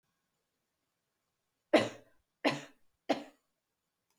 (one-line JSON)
{"three_cough_length": "4.2 s", "three_cough_amplitude": 10151, "three_cough_signal_mean_std_ratio": 0.21, "survey_phase": "beta (2021-08-13 to 2022-03-07)", "age": "65+", "gender": "Female", "wearing_mask": "No", "symptom_none": true, "smoker_status": "Ex-smoker", "respiratory_condition_asthma": false, "respiratory_condition_other": false, "recruitment_source": "REACT", "submission_delay": "2 days", "covid_test_result": "Negative", "covid_test_method": "RT-qPCR", "influenza_a_test_result": "Negative", "influenza_b_test_result": "Negative"}